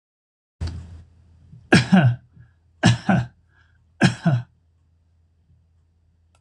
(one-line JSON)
{"three_cough_length": "6.4 s", "three_cough_amplitude": 26027, "three_cough_signal_mean_std_ratio": 0.34, "survey_phase": "beta (2021-08-13 to 2022-03-07)", "age": "65+", "gender": "Male", "wearing_mask": "No", "symptom_none": true, "smoker_status": "Never smoked", "respiratory_condition_asthma": false, "respiratory_condition_other": false, "recruitment_source": "REACT", "submission_delay": "5 days", "covid_test_result": "Negative", "covid_test_method": "RT-qPCR"}